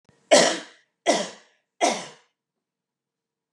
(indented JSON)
{
  "three_cough_length": "3.5 s",
  "three_cough_amplitude": 26043,
  "three_cough_signal_mean_std_ratio": 0.32,
  "survey_phase": "beta (2021-08-13 to 2022-03-07)",
  "age": "45-64",
  "gender": "Female",
  "wearing_mask": "No",
  "symptom_none": true,
  "smoker_status": "Never smoked",
  "respiratory_condition_asthma": true,
  "respiratory_condition_other": false,
  "recruitment_source": "REACT",
  "submission_delay": "1 day",
  "covid_test_result": "Negative",
  "covid_test_method": "RT-qPCR",
  "influenza_a_test_result": "Negative",
  "influenza_b_test_result": "Negative"
}